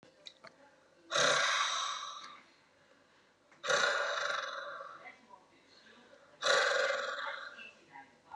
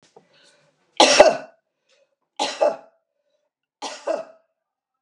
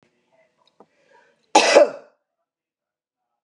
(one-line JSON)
{"exhalation_length": "8.4 s", "exhalation_amplitude": 5999, "exhalation_signal_mean_std_ratio": 0.54, "three_cough_length": "5.0 s", "three_cough_amplitude": 32768, "three_cough_signal_mean_std_ratio": 0.28, "cough_length": "3.4 s", "cough_amplitude": 32433, "cough_signal_mean_std_ratio": 0.24, "survey_phase": "beta (2021-08-13 to 2022-03-07)", "age": "65+", "gender": "Female", "wearing_mask": "No", "symptom_none": true, "smoker_status": "Never smoked", "respiratory_condition_asthma": false, "respiratory_condition_other": false, "recruitment_source": "REACT", "submission_delay": "0 days", "covid_test_result": "Negative", "covid_test_method": "RT-qPCR", "influenza_a_test_result": "Negative", "influenza_b_test_result": "Negative"}